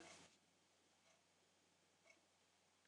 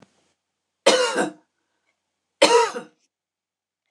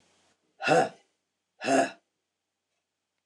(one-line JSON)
{"cough_length": "2.9 s", "cough_amplitude": 103, "cough_signal_mean_std_ratio": 0.67, "three_cough_length": "3.9 s", "three_cough_amplitude": 26027, "three_cough_signal_mean_std_ratio": 0.33, "exhalation_length": "3.3 s", "exhalation_amplitude": 11781, "exhalation_signal_mean_std_ratio": 0.31, "survey_phase": "beta (2021-08-13 to 2022-03-07)", "age": "65+", "gender": "Female", "wearing_mask": "No", "symptom_none": true, "symptom_onset": "6 days", "smoker_status": "Never smoked", "respiratory_condition_asthma": false, "respiratory_condition_other": false, "recruitment_source": "REACT", "submission_delay": "2 days", "covid_test_result": "Negative", "covid_test_method": "RT-qPCR"}